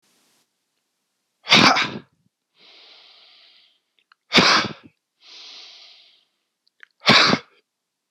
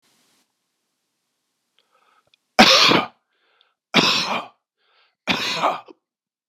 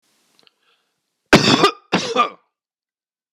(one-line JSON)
{"exhalation_length": "8.1 s", "exhalation_amplitude": 26028, "exhalation_signal_mean_std_ratio": 0.29, "three_cough_length": "6.5 s", "three_cough_amplitude": 26028, "three_cough_signal_mean_std_ratio": 0.33, "cough_length": "3.3 s", "cough_amplitude": 26028, "cough_signal_mean_std_ratio": 0.33, "survey_phase": "beta (2021-08-13 to 2022-03-07)", "age": "45-64", "gender": "Male", "wearing_mask": "No", "symptom_none": true, "smoker_status": "Never smoked", "respiratory_condition_asthma": false, "respiratory_condition_other": false, "recruitment_source": "REACT", "submission_delay": "2 days", "covid_test_result": "Negative", "covid_test_method": "RT-qPCR", "influenza_a_test_result": "Negative", "influenza_b_test_result": "Negative"}